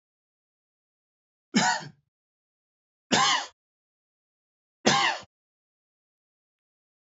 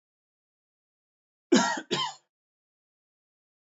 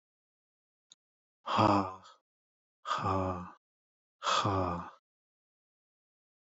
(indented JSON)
{
  "three_cough_length": "7.1 s",
  "three_cough_amplitude": 18371,
  "three_cough_signal_mean_std_ratio": 0.28,
  "cough_length": "3.8 s",
  "cough_amplitude": 13651,
  "cough_signal_mean_std_ratio": 0.25,
  "exhalation_length": "6.5 s",
  "exhalation_amplitude": 7469,
  "exhalation_signal_mean_std_ratio": 0.39,
  "survey_phase": "beta (2021-08-13 to 2022-03-07)",
  "age": "18-44",
  "gender": "Male",
  "wearing_mask": "No",
  "symptom_none": true,
  "smoker_status": "Never smoked",
  "respiratory_condition_asthma": false,
  "respiratory_condition_other": false,
  "recruitment_source": "REACT",
  "submission_delay": "1 day",
  "covid_test_result": "Negative",
  "covid_test_method": "RT-qPCR",
  "influenza_a_test_result": "Negative",
  "influenza_b_test_result": "Negative"
}